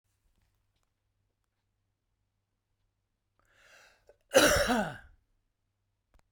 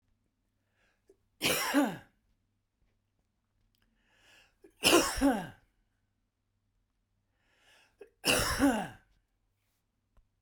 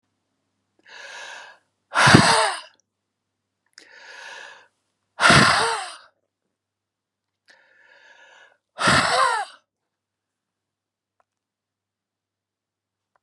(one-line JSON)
{"cough_length": "6.3 s", "cough_amplitude": 12909, "cough_signal_mean_std_ratio": 0.23, "three_cough_length": "10.4 s", "three_cough_amplitude": 11897, "three_cough_signal_mean_std_ratio": 0.32, "exhalation_length": "13.2 s", "exhalation_amplitude": 32768, "exhalation_signal_mean_std_ratio": 0.3, "survey_phase": "beta (2021-08-13 to 2022-03-07)", "age": "65+", "gender": "Male", "wearing_mask": "No", "symptom_none": true, "smoker_status": "Ex-smoker", "respiratory_condition_asthma": false, "respiratory_condition_other": false, "recruitment_source": "REACT", "submission_delay": "1 day", "covid_test_result": "Negative", "covid_test_method": "RT-qPCR"}